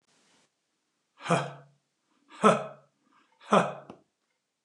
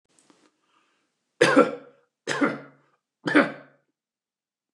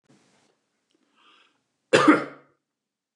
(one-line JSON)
{"exhalation_length": "4.6 s", "exhalation_amplitude": 17406, "exhalation_signal_mean_std_ratio": 0.27, "three_cough_length": "4.7 s", "three_cough_amplitude": 23186, "three_cough_signal_mean_std_ratio": 0.3, "cough_length": "3.2 s", "cough_amplitude": 24620, "cough_signal_mean_std_ratio": 0.23, "survey_phase": "beta (2021-08-13 to 2022-03-07)", "age": "65+", "gender": "Male", "wearing_mask": "No", "symptom_none": true, "smoker_status": "Ex-smoker", "respiratory_condition_asthma": false, "respiratory_condition_other": false, "recruitment_source": "REACT", "submission_delay": "1 day", "covid_test_result": "Negative", "covid_test_method": "RT-qPCR", "influenza_a_test_result": "Unknown/Void", "influenza_b_test_result": "Unknown/Void"}